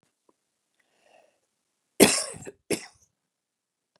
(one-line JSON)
{"cough_length": "4.0 s", "cough_amplitude": 32085, "cough_signal_mean_std_ratio": 0.19, "survey_phase": "beta (2021-08-13 to 2022-03-07)", "age": "45-64", "gender": "Female", "wearing_mask": "No", "symptom_none": true, "smoker_status": "Never smoked", "respiratory_condition_asthma": false, "respiratory_condition_other": false, "recruitment_source": "Test and Trace", "submission_delay": "0 days", "covid_test_result": "Negative", "covid_test_method": "LFT"}